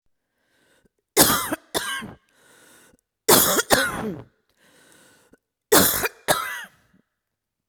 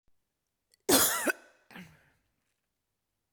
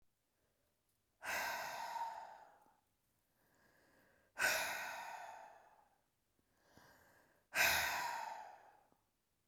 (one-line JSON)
{"three_cough_length": "7.7 s", "three_cough_amplitude": 32766, "three_cough_signal_mean_std_ratio": 0.37, "cough_length": "3.3 s", "cough_amplitude": 10540, "cough_signal_mean_std_ratio": 0.28, "exhalation_length": "9.5 s", "exhalation_amplitude": 3163, "exhalation_signal_mean_std_ratio": 0.43, "survey_phase": "beta (2021-08-13 to 2022-03-07)", "age": "45-64", "gender": "Female", "wearing_mask": "No", "symptom_cough_any": true, "symptom_onset": "2 days", "smoker_status": "Never smoked", "respiratory_condition_asthma": false, "respiratory_condition_other": false, "recruitment_source": "REACT", "submission_delay": "1 day", "covid_test_result": "Negative", "covid_test_method": "RT-qPCR"}